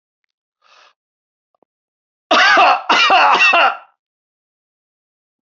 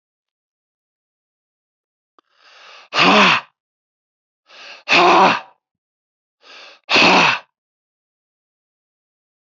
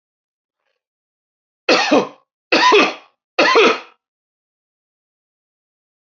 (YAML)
cough_length: 5.5 s
cough_amplitude: 29536
cough_signal_mean_std_ratio: 0.43
exhalation_length: 9.5 s
exhalation_amplitude: 31779
exhalation_signal_mean_std_ratio: 0.32
three_cough_length: 6.1 s
three_cough_amplitude: 28987
three_cough_signal_mean_std_ratio: 0.36
survey_phase: beta (2021-08-13 to 2022-03-07)
age: 65+
gender: Male
wearing_mask: 'No'
symptom_none: true
smoker_status: Never smoked
respiratory_condition_asthma: false
respiratory_condition_other: false
recruitment_source: REACT
submission_delay: 2 days
covid_test_result: Negative
covid_test_method: RT-qPCR